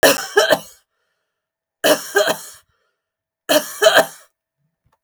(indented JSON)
{
  "three_cough_length": "5.0 s",
  "three_cough_amplitude": 32768,
  "three_cough_signal_mean_std_ratio": 0.38,
  "survey_phase": "beta (2021-08-13 to 2022-03-07)",
  "age": "18-44",
  "gender": "Female",
  "wearing_mask": "No",
  "symptom_none": true,
  "symptom_onset": "6 days",
  "smoker_status": "Never smoked",
  "respiratory_condition_asthma": false,
  "respiratory_condition_other": false,
  "recruitment_source": "REACT",
  "submission_delay": "6 days",
  "covid_test_result": "Positive",
  "covid_test_method": "RT-qPCR",
  "covid_ct_value": 22.0,
  "covid_ct_gene": "E gene",
  "influenza_a_test_result": "Negative",
  "influenza_b_test_result": "Negative"
}